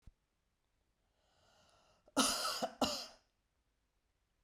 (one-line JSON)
{"cough_length": "4.4 s", "cough_amplitude": 4692, "cough_signal_mean_std_ratio": 0.32, "survey_phase": "beta (2021-08-13 to 2022-03-07)", "age": "45-64", "gender": "Female", "wearing_mask": "No", "symptom_runny_or_blocked_nose": true, "symptom_fatigue": true, "symptom_fever_high_temperature": true, "symptom_headache": true, "symptom_onset": "4 days", "smoker_status": "Never smoked", "respiratory_condition_asthma": false, "respiratory_condition_other": false, "recruitment_source": "Test and Trace", "submission_delay": "2 days", "covid_test_result": "Positive", "covid_test_method": "RT-qPCR", "covid_ct_value": 19.2, "covid_ct_gene": "ORF1ab gene", "covid_ct_mean": 20.1, "covid_viral_load": "260000 copies/ml", "covid_viral_load_category": "Low viral load (10K-1M copies/ml)"}